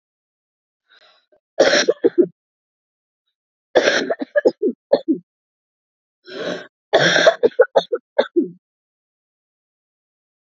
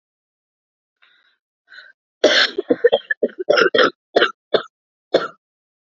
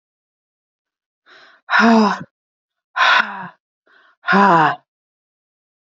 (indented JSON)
{
  "three_cough_length": "10.6 s",
  "three_cough_amplitude": 32768,
  "three_cough_signal_mean_std_ratio": 0.34,
  "cough_length": "5.9 s",
  "cough_amplitude": 31430,
  "cough_signal_mean_std_ratio": 0.35,
  "exhalation_length": "6.0 s",
  "exhalation_amplitude": 27853,
  "exhalation_signal_mean_std_ratio": 0.39,
  "survey_phase": "beta (2021-08-13 to 2022-03-07)",
  "age": "18-44",
  "gender": "Female",
  "wearing_mask": "No",
  "symptom_cough_any": true,
  "symptom_new_continuous_cough": true,
  "symptom_runny_or_blocked_nose": true,
  "symptom_shortness_of_breath": true,
  "symptom_sore_throat": true,
  "symptom_fatigue": true,
  "symptom_fever_high_temperature": true,
  "symptom_headache": true,
  "symptom_onset": "3 days",
  "smoker_status": "Ex-smoker",
  "respiratory_condition_asthma": false,
  "respiratory_condition_other": false,
  "recruitment_source": "Test and Trace",
  "submission_delay": "1 day",
  "covid_test_result": "Positive",
  "covid_test_method": "RT-qPCR",
  "covid_ct_value": 19.8,
  "covid_ct_gene": "ORF1ab gene"
}